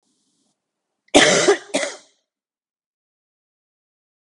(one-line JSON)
{"cough_length": "4.4 s", "cough_amplitude": 32768, "cough_signal_mean_std_ratio": 0.27, "survey_phase": "beta (2021-08-13 to 2022-03-07)", "age": "18-44", "gender": "Female", "wearing_mask": "No", "symptom_cough_any": true, "symptom_fever_high_temperature": true, "symptom_headache": true, "symptom_change_to_sense_of_smell_or_taste": true, "smoker_status": "Ex-smoker", "respiratory_condition_asthma": false, "respiratory_condition_other": false, "recruitment_source": "Test and Trace", "submission_delay": "2 days", "covid_test_result": "Positive", "covid_test_method": "RT-qPCR"}